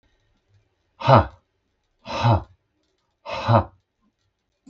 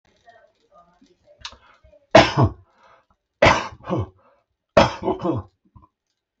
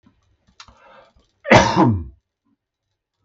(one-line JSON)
{"exhalation_length": "4.7 s", "exhalation_amplitude": 32768, "exhalation_signal_mean_std_ratio": 0.3, "three_cough_length": "6.4 s", "three_cough_amplitude": 32768, "three_cough_signal_mean_std_ratio": 0.3, "cough_length": "3.2 s", "cough_amplitude": 32768, "cough_signal_mean_std_ratio": 0.31, "survey_phase": "beta (2021-08-13 to 2022-03-07)", "age": "45-64", "gender": "Male", "wearing_mask": "No", "symptom_none": true, "smoker_status": "Never smoked", "respiratory_condition_asthma": false, "respiratory_condition_other": false, "recruitment_source": "REACT", "submission_delay": "2 days", "covid_test_result": "Negative", "covid_test_method": "RT-qPCR"}